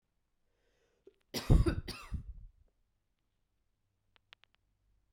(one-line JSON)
{"cough_length": "5.1 s", "cough_amplitude": 9068, "cough_signal_mean_std_ratio": 0.22, "survey_phase": "beta (2021-08-13 to 2022-03-07)", "age": "18-44", "gender": "Female", "wearing_mask": "No", "symptom_cough_any": true, "symptom_runny_or_blocked_nose": true, "symptom_shortness_of_breath": true, "symptom_sore_throat": true, "symptom_abdominal_pain": true, "symptom_fatigue": true, "symptom_fever_high_temperature": true, "symptom_headache": true, "symptom_change_to_sense_of_smell_or_taste": true, "symptom_onset": "6 days", "smoker_status": "Never smoked", "respiratory_condition_asthma": false, "respiratory_condition_other": false, "recruitment_source": "Test and Trace", "submission_delay": "2 days", "covid_test_result": "Positive", "covid_test_method": "RT-qPCR", "covid_ct_value": 19.3, "covid_ct_gene": "ORF1ab gene", "covid_ct_mean": 19.9, "covid_viral_load": "290000 copies/ml", "covid_viral_load_category": "Low viral load (10K-1M copies/ml)"}